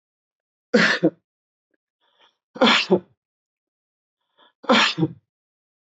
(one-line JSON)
{"three_cough_length": "6.0 s", "three_cough_amplitude": 21287, "three_cough_signal_mean_std_ratio": 0.32, "survey_phase": "beta (2021-08-13 to 2022-03-07)", "age": "45-64", "gender": "Male", "wearing_mask": "No", "symptom_none": true, "smoker_status": "Never smoked", "respiratory_condition_asthma": false, "respiratory_condition_other": false, "recruitment_source": "Test and Trace", "submission_delay": "0 days", "covid_test_result": "Negative", "covid_test_method": "LFT"}